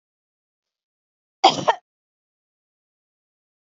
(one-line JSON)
{"cough_length": "3.8 s", "cough_amplitude": 28007, "cough_signal_mean_std_ratio": 0.16, "survey_phase": "beta (2021-08-13 to 2022-03-07)", "age": "45-64", "gender": "Female", "wearing_mask": "No", "symptom_cough_any": true, "symptom_runny_or_blocked_nose": true, "symptom_sore_throat": true, "symptom_fatigue": true, "symptom_onset": "4 days", "smoker_status": "Never smoked", "respiratory_condition_asthma": false, "respiratory_condition_other": false, "recruitment_source": "Test and Trace", "submission_delay": "2 days", "covid_test_result": "Positive", "covid_test_method": "ePCR"}